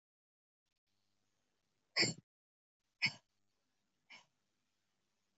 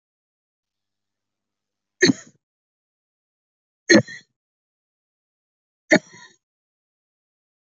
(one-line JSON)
{"exhalation_length": "5.4 s", "exhalation_amplitude": 3459, "exhalation_signal_mean_std_ratio": 0.17, "three_cough_length": "7.7 s", "three_cough_amplitude": 27164, "three_cough_signal_mean_std_ratio": 0.16, "survey_phase": "alpha (2021-03-01 to 2021-08-12)", "age": "45-64", "gender": "Female", "wearing_mask": "No", "symptom_cough_any": true, "symptom_change_to_sense_of_smell_or_taste": true, "symptom_loss_of_taste": true, "smoker_status": "Never smoked", "respiratory_condition_asthma": false, "respiratory_condition_other": false, "recruitment_source": "Test and Trace", "submission_delay": "2 days", "covid_test_result": "Positive", "covid_test_method": "RT-qPCR", "covid_ct_value": 16.6, "covid_ct_gene": "ORF1ab gene", "covid_ct_mean": 17.2, "covid_viral_load": "2300000 copies/ml", "covid_viral_load_category": "High viral load (>1M copies/ml)"}